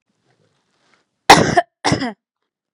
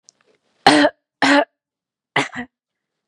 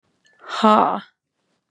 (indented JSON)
{
  "cough_length": "2.7 s",
  "cough_amplitude": 32768,
  "cough_signal_mean_std_ratio": 0.29,
  "three_cough_length": "3.1 s",
  "three_cough_amplitude": 32768,
  "three_cough_signal_mean_std_ratio": 0.34,
  "exhalation_length": "1.7 s",
  "exhalation_amplitude": 29735,
  "exhalation_signal_mean_std_ratio": 0.36,
  "survey_phase": "beta (2021-08-13 to 2022-03-07)",
  "age": "18-44",
  "gender": "Female",
  "wearing_mask": "No",
  "symptom_runny_or_blocked_nose": true,
  "smoker_status": "Never smoked",
  "respiratory_condition_asthma": false,
  "respiratory_condition_other": false,
  "recruitment_source": "REACT",
  "submission_delay": "8 days",
  "covid_test_result": "Negative",
  "covid_test_method": "RT-qPCR",
  "influenza_a_test_result": "Negative",
  "influenza_b_test_result": "Negative"
}